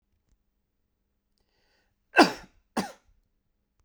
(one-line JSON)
{"cough_length": "3.8 s", "cough_amplitude": 23207, "cough_signal_mean_std_ratio": 0.17, "survey_phase": "beta (2021-08-13 to 2022-03-07)", "age": "18-44", "gender": "Male", "wearing_mask": "No", "symptom_cough_any": true, "symptom_runny_or_blocked_nose": true, "symptom_fatigue": true, "symptom_headache": true, "symptom_change_to_sense_of_smell_or_taste": true, "symptom_loss_of_taste": true, "symptom_onset": "2 days", "smoker_status": "Never smoked", "respiratory_condition_asthma": false, "respiratory_condition_other": false, "recruitment_source": "Test and Trace", "submission_delay": "1 day", "covid_test_result": "Positive", "covid_test_method": "RT-qPCR", "covid_ct_value": 16.1, "covid_ct_gene": "ORF1ab gene", "covid_ct_mean": 16.9, "covid_viral_load": "2900000 copies/ml", "covid_viral_load_category": "High viral load (>1M copies/ml)"}